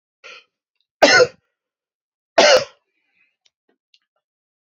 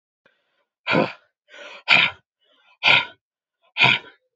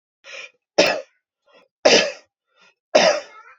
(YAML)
cough_length: 4.8 s
cough_amplitude: 31342
cough_signal_mean_std_ratio: 0.26
exhalation_length: 4.4 s
exhalation_amplitude: 30609
exhalation_signal_mean_std_ratio: 0.35
three_cough_length: 3.6 s
three_cough_amplitude: 28855
three_cough_signal_mean_std_ratio: 0.36
survey_phase: beta (2021-08-13 to 2022-03-07)
age: 18-44
gender: Male
wearing_mask: 'No'
symptom_none: true
smoker_status: Never smoked
respiratory_condition_asthma: false
respiratory_condition_other: false
recruitment_source: REACT
submission_delay: 2 days
covid_test_result: Negative
covid_test_method: RT-qPCR
influenza_a_test_result: Negative
influenza_b_test_result: Negative